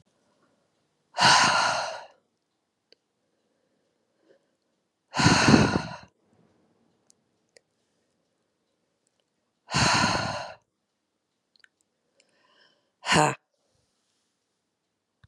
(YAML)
exhalation_length: 15.3 s
exhalation_amplitude: 23113
exhalation_signal_mean_std_ratio: 0.3
survey_phase: beta (2021-08-13 to 2022-03-07)
age: 45-64
gender: Female
wearing_mask: 'No'
symptom_cough_any: true
symptom_runny_or_blocked_nose: true
symptom_shortness_of_breath: true
symptom_abdominal_pain: true
symptom_diarrhoea: true
symptom_fatigue: true
symptom_headache: true
smoker_status: Never smoked
respiratory_condition_asthma: false
respiratory_condition_other: false
recruitment_source: Test and Trace
submission_delay: 2 days
covid_test_result: Positive
covid_test_method: RT-qPCR
covid_ct_value: 22.3
covid_ct_gene: ORF1ab gene